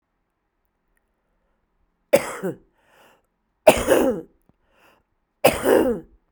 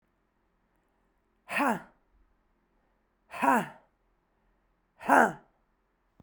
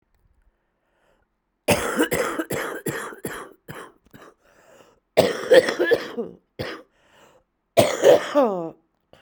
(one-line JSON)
{"three_cough_length": "6.3 s", "three_cough_amplitude": 32768, "three_cough_signal_mean_std_ratio": 0.31, "exhalation_length": "6.2 s", "exhalation_amplitude": 14065, "exhalation_signal_mean_std_ratio": 0.26, "cough_length": "9.2 s", "cough_amplitude": 32768, "cough_signal_mean_std_ratio": 0.4, "survey_phase": "beta (2021-08-13 to 2022-03-07)", "age": "45-64", "gender": "Female", "wearing_mask": "No", "symptom_new_continuous_cough": true, "symptom_runny_or_blocked_nose": true, "symptom_shortness_of_breath": true, "symptom_sore_throat": true, "symptom_abdominal_pain": true, "symptom_fatigue": true, "symptom_headache": true, "symptom_change_to_sense_of_smell_or_taste": true, "symptom_onset": "3 days", "smoker_status": "Current smoker (11 or more cigarettes per day)", "respiratory_condition_asthma": false, "respiratory_condition_other": false, "recruitment_source": "Test and Trace", "submission_delay": "1 day", "covid_test_result": "Positive", "covid_test_method": "RT-qPCR", "covid_ct_value": 18.7, "covid_ct_gene": "ORF1ab gene", "covid_ct_mean": 19.4, "covid_viral_load": "440000 copies/ml", "covid_viral_load_category": "Low viral load (10K-1M copies/ml)"}